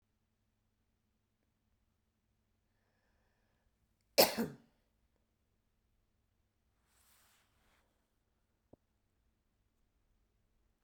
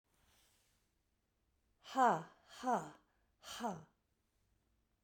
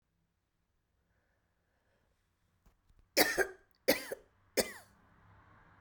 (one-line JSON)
{"cough_length": "10.8 s", "cough_amplitude": 8140, "cough_signal_mean_std_ratio": 0.12, "exhalation_length": "5.0 s", "exhalation_amplitude": 3728, "exhalation_signal_mean_std_ratio": 0.27, "three_cough_length": "5.8 s", "three_cough_amplitude": 8685, "three_cough_signal_mean_std_ratio": 0.24, "survey_phase": "beta (2021-08-13 to 2022-03-07)", "age": "45-64", "gender": "Female", "wearing_mask": "No", "symptom_none": true, "smoker_status": "Never smoked", "respiratory_condition_asthma": true, "respiratory_condition_other": false, "recruitment_source": "REACT", "submission_delay": "2 days", "covid_test_result": "Negative", "covid_test_method": "RT-qPCR"}